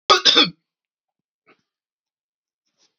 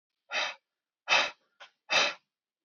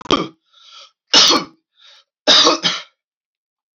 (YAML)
cough_length: 3.0 s
cough_amplitude: 28929
cough_signal_mean_std_ratio: 0.25
exhalation_length: 2.6 s
exhalation_amplitude: 8939
exhalation_signal_mean_std_ratio: 0.38
three_cough_length: 3.8 s
three_cough_amplitude: 31710
three_cough_signal_mean_std_ratio: 0.39
survey_phase: alpha (2021-03-01 to 2021-08-12)
age: 18-44
gender: Male
wearing_mask: 'No'
symptom_headache: true
smoker_status: Never smoked
respiratory_condition_asthma: false
respiratory_condition_other: false
recruitment_source: Test and Trace
submission_delay: 2 days
covid_test_result: Positive
covid_test_method: RT-qPCR
covid_ct_value: 22.0
covid_ct_gene: ORF1ab gene
covid_ct_mean: 22.5
covid_viral_load: 42000 copies/ml
covid_viral_load_category: Low viral load (10K-1M copies/ml)